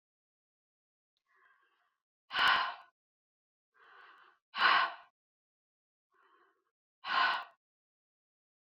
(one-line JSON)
{"exhalation_length": "8.6 s", "exhalation_amplitude": 6666, "exhalation_signal_mean_std_ratio": 0.28, "survey_phase": "beta (2021-08-13 to 2022-03-07)", "age": "65+", "gender": "Female", "wearing_mask": "No", "symptom_none": true, "smoker_status": "Never smoked", "respiratory_condition_asthma": false, "respiratory_condition_other": false, "recruitment_source": "REACT", "submission_delay": "2 days", "covid_test_result": "Negative", "covid_test_method": "RT-qPCR"}